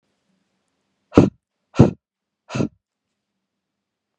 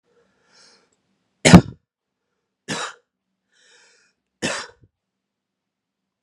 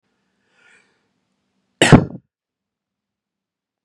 {"exhalation_length": "4.2 s", "exhalation_amplitude": 32768, "exhalation_signal_mean_std_ratio": 0.2, "three_cough_length": "6.2 s", "three_cough_amplitude": 32768, "three_cough_signal_mean_std_ratio": 0.16, "cough_length": "3.8 s", "cough_amplitude": 32768, "cough_signal_mean_std_ratio": 0.17, "survey_phase": "beta (2021-08-13 to 2022-03-07)", "age": "18-44", "gender": "Male", "wearing_mask": "No", "symptom_none": true, "smoker_status": "Never smoked", "respiratory_condition_asthma": true, "respiratory_condition_other": false, "recruitment_source": "REACT", "submission_delay": "4 days", "covid_test_result": "Negative", "covid_test_method": "RT-qPCR", "influenza_a_test_result": "Negative", "influenza_b_test_result": "Negative"}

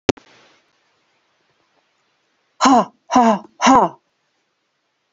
{"exhalation_length": "5.1 s", "exhalation_amplitude": 30820, "exhalation_signal_mean_std_ratio": 0.31, "survey_phase": "beta (2021-08-13 to 2022-03-07)", "age": "45-64", "gender": "Female", "wearing_mask": "No", "symptom_cough_any": true, "symptom_runny_or_blocked_nose": true, "symptom_shortness_of_breath": true, "symptom_fatigue": true, "symptom_change_to_sense_of_smell_or_taste": true, "smoker_status": "Never smoked", "respiratory_condition_asthma": false, "respiratory_condition_other": false, "recruitment_source": "Test and Trace", "submission_delay": "2 days", "covid_test_result": "Positive", "covid_test_method": "RT-qPCR", "covid_ct_value": 13.6, "covid_ct_gene": "ORF1ab gene", "covid_ct_mean": 13.7, "covid_viral_load": "32000000 copies/ml", "covid_viral_load_category": "High viral load (>1M copies/ml)"}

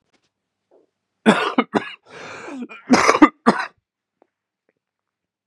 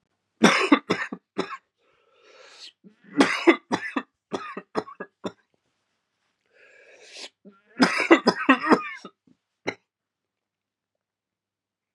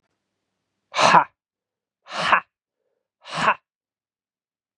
{"cough_length": "5.5 s", "cough_amplitude": 32768, "cough_signal_mean_std_ratio": 0.3, "three_cough_length": "11.9 s", "three_cough_amplitude": 28098, "three_cough_signal_mean_std_ratio": 0.3, "exhalation_length": "4.8 s", "exhalation_amplitude": 32186, "exhalation_signal_mean_std_ratio": 0.28, "survey_phase": "beta (2021-08-13 to 2022-03-07)", "age": "18-44", "gender": "Male", "wearing_mask": "No", "symptom_cough_any": true, "symptom_abdominal_pain": true, "symptom_fatigue": true, "symptom_onset": "5 days", "smoker_status": "Never smoked", "respiratory_condition_asthma": true, "respiratory_condition_other": false, "recruitment_source": "Test and Trace", "submission_delay": "2 days", "covid_test_result": "Positive", "covid_test_method": "RT-qPCR", "covid_ct_value": 16.3, "covid_ct_gene": "ORF1ab gene", "covid_ct_mean": 16.4, "covid_viral_load": "4200000 copies/ml", "covid_viral_load_category": "High viral load (>1M copies/ml)"}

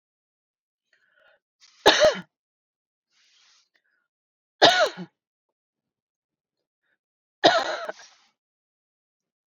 {"three_cough_length": "9.6 s", "three_cough_amplitude": 29078, "three_cough_signal_mean_std_ratio": 0.23, "survey_phase": "beta (2021-08-13 to 2022-03-07)", "age": "45-64", "gender": "Female", "wearing_mask": "No", "symptom_none": true, "smoker_status": "Ex-smoker", "respiratory_condition_asthma": false, "respiratory_condition_other": false, "recruitment_source": "REACT", "submission_delay": "1 day", "covid_test_result": "Negative", "covid_test_method": "RT-qPCR"}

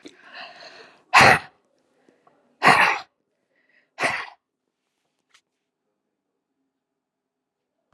{"exhalation_length": "7.9 s", "exhalation_amplitude": 31863, "exhalation_signal_mean_std_ratio": 0.24, "survey_phase": "alpha (2021-03-01 to 2021-08-12)", "age": "45-64", "gender": "Female", "wearing_mask": "No", "symptom_none": true, "smoker_status": "Never smoked", "respiratory_condition_asthma": false, "respiratory_condition_other": false, "recruitment_source": "REACT", "submission_delay": "6 days", "covid_test_result": "Negative", "covid_test_method": "RT-qPCR"}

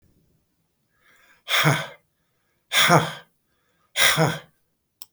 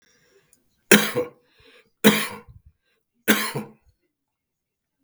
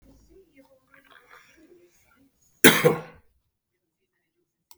{"exhalation_length": "5.1 s", "exhalation_amplitude": 25432, "exhalation_signal_mean_std_ratio": 0.37, "three_cough_length": "5.0 s", "three_cough_amplitude": 32768, "three_cough_signal_mean_std_ratio": 0.27, "cough_length": "4.8 s", "cough_amplitude": 32768, "cough_signal_mean_std_ratio": 0.19, "survey_phase": "beta (2021-08-13 to 2022-03-07)", "age": "65+", "gender": "Male", "wearing_mask": "No", "symptom_none": true, "smoker_status": "Never smoked", "respiratory_condition_asthma": false, "respiratory_condition_other": false, "recruitment_source": "REACT", "submission_delay": "2 days", "covid_test_result": "Negative", "covid_test_method": "RT-qPCR", "influenza_a_test_result": "Negative", "influenza_b_test_result": "Negative"}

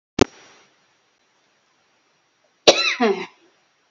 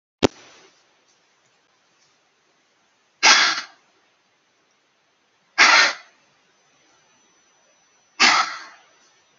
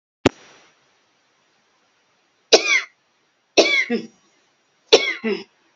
{"cough_length": "3.9 s", "cough_amplitude": 31212, "cough_signal_mean_std_ratio": 0.25, "exhalation_length": "9.4 s", "exhalation_amplitude": 32768, "exhalation_signal_mean_std_ratio": 0.27, "three_cough_length": "5.8 s", "three_cough_amplitude": 32099, "three_cough_signal_mean_std_ratio": 0.3, "survey_phase": "beta (2021-08-13 to 2022-03-07)", "age": "18-44", "gender": "Female", "wearing_mask": "No", "symptom_cough_any": true, "symptom_shortness_of_breath": true, "smoker_status": "Never smoked", "respiratory_condition_asthma": false, "respiratory_condition_other": true, "recruitment_source": "REACT", "submission_delay": "1 day", "covid_test_result": "Negative", "covid_test_method": "RT-qPCR", "influenza_a_test_result": "Negative", "influenza_b_test_result": "Negative"}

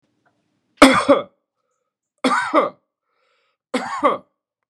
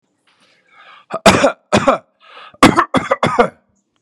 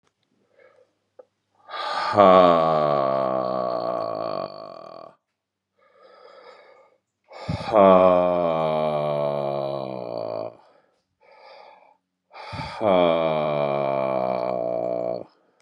{"three_cough_length": "4.7 s", "three_cough_amplitude": 32768, "three_cough_signal_mean_std_ratio": 0.34, "cough_length": "4.0 s", "cough_amplitude": 32768, "cough_signal_mean_std_ratio": 0.4, "exhalation_length": "15.6 s", "exhalation_amplitude": 26310, "exhalation_signal_mean_std_ratio": 0.53, "survey_phase": "beta (2021-08-13 to 2022-03-07)", "age": "45-64", "gender": "Male", "wearing_mask": "No", "symptom_cough_any": true, "symptom_runny_or_blocked_nose": true, "symptom_sore_throat": true, "symptom_fatigue": true, "symptom_headache": true, "symptom_onset": "3 days", "smoker_status": "Ex-smoker", "respiratory_condition_asthma": false, "respiratory_condition_other": false, "recruitment_source": "Test and Trace", "submission_delay": "1 day", "covid_test_result": "Positive", "covid_test_method": "RT-qPCR", "covid_ct_value": 21.6, "covid_ct_gene": "E gene"}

